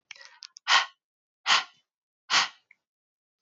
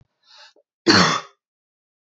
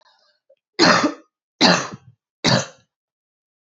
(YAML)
exhalation_length: 3.4 s
exhalation_amplitude: 16054
exhalation_signal_mean_std_ratio: 0.3
cough_length: 2.0 s
cough_amplitude: 30339
cough_signal_mean_std_ratio: 0.32
three_cough_length: 3.7 s
three_cough_amplitude: 31485
three_cough_signal_mean_std_ratio: 0.36
survey_phase: beta (2021-08-13 to 2022-03-07)
age: 18-44
gender: Female
wearing_mask: 'No'
symptom_cough_any: true
symptom_runny_or_blocked_nose: true
symptom_sore_throat: true
symptom_fatigue: true
symptom_onset: 2 days
smoker_status: Never smoked
respiratory_condition_asthma: false
respiratory_condition_other: false
recruitment_source: Test and Trace
submission_delay: 1 day
covid_test_result: Positive
covid_test_method: RT-qPCR